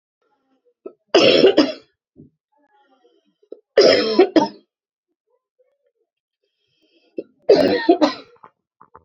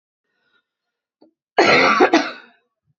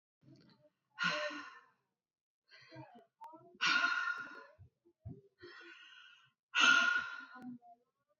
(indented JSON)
{
  "three_cough_length": "9.0 s",
  "three_cough_amplitude": 32426,
  "three_cough_signal_mean_std_ratio": 0.34,
  "cough_length": "3.0 s",
  "cough_amplitude": 31338,
  "cough_signal_mean_std_ratio": 0.39,
  "exhalation_length": "8.2 s",
  "exhalation_amplitude": 5317,
  "exhalation_signal_mean_std_ratio": 0.39,
  "survey_phase": "beta (2021-08-13 to 2022-03-07)",
  "age": "45-64",
  "gender": "Female",
  "wearing_mask": "No",
  "symptom_cough_any": true,
  "symptom_runny_or_blocked_nose": true,
  "symptom_onset": "7 days",
  "smoker_status": "Never smoked",
  "respiratory_condition_asthma": false,
  "respiratory_condition_other": false,
  "recruitment_source": "REACT",
  "submission_delay": "3 days",
  "covid_test_result": "Negative",
  "covid_test_method": "RT-qPCR",
  "influenza_a_test_result": "Negative",
  "influenza_b_test_result": "Negative"
}